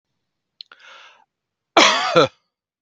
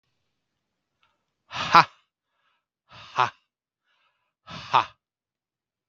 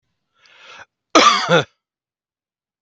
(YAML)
three_cough_length: 2.8 s
three_cough_amplitude: 32768
three_cough_signal_mean_std_ratio: 0.32
exhalation_length: 5.9 s
exhalation_amplitude: 32768
exhalation_signal_mean_std_ratio: 0.18
cough_length: 2.8 s
cough_amplitude: 32768
cough_signal_mean_std_ratio: 0.32
survey_phase: beta (2021-08-13 to 2022-03-07)
age: 45-64
gender: Male
wearing_mask: 'No'
symptom_none: true
symptom_onset: 12 days
smoker_status: Ex-smoker
respiratory_condition_asthma: false
respiratory_condition_other: false
recruitment_source: REACT
submission_delay: 10 days
covid_test_result: Negative
covid_test_method: RT-qPCR